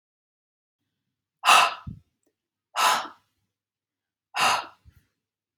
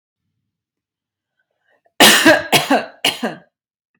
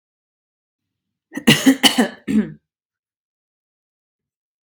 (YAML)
exhalation_length: 5.6 s
exhalation_amplitude: 26820
exhalation_signal_mean_std_ratio: 0.29
three_cough_length: 4.0 s
three_cough_amplitude: 32768
three_cough_signal_mean_std_ratio: 0.36
cough_length: 4.6 s
cough_amplitude: 32768
cough_signal_mean_std_ratio: 0.28
survey_phase: beta (2021-08-13 to 2022-03-07)
age: 45-64
gender: Female
wearing_mask: 'No'
symptom_none: true
symptom_onset: 12 days
smoker_status: Ex-smoker
respiratory_condition_asthma: false
respiratory_condition_other: false
recruitment_source: REACT
submission_delay: 2 days
covid_test_result: Negative
covid_test_method: RT-qPCR
influenza_a_test_result: Negative
influenza_b_test_result: Negative